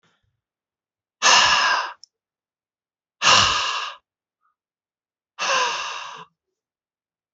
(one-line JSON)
{"exhalation_length": "7.3 s", "exhalation_amplitude": 25427, "exhalation_signal_mean_std_ratio": 0.39, "survey_phase": "beta (2021-08-13 to 2022-03-07)", "age": "18-44", "gender": "Male", "wearing_mask": "No", "symptom_runny_or_blocked_nose": true, "symptom_sore_throat": true, "symptom_fatigue": true, "symptom_headache": true, "smoker_status": "Never smoked", "respiratory_condition_asthma": false, "respiratory_condition_other": false, "recruitment_source": "Test and Trace", "submission_delay": "1 day", "covid_test_result": "Positive", "covid_test_method": "RT-qPCR", "covid_ct_value": 15.0, "covid_ct_gene": "ORF1ab gene", "covid_ct_mean": 15.2, "covid_viral_load": "10000000 copies/ml", "covid_viral_load_category": "High viral load (>1M copies/ml)"}